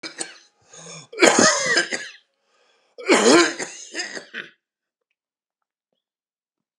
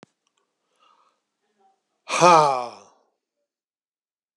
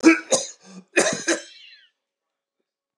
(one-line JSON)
{"three_cough_length": "6.8 s", "three_cough_amplitude": 32768, "three_cough_signal_mean_std_ratio": 0.36, "exhalation_length": "4.4 s", "exhalation_amplitude": 30830, "exhalation_signal_mean_std_ratio": 0.24, "cough_length": "3.0 s", "cough_amplitude": 25116, "cough_signal_mean_std_ratio": 0.34, "survey_phase": "beta (2021-08-13 to 2022-03-07)", "age": "65+", "gender": "Male", "wearing_mask": "No", "symptom_none": true, "smoker_status": "Never smoked", "respiratory_condition_asthma": false, "respiratory_condition_other": false, "recruitment_source": "REACT", "submission_delay": "1 day", "covid_test_result": "Negative", "covid_test_method": "RT-qPCR"}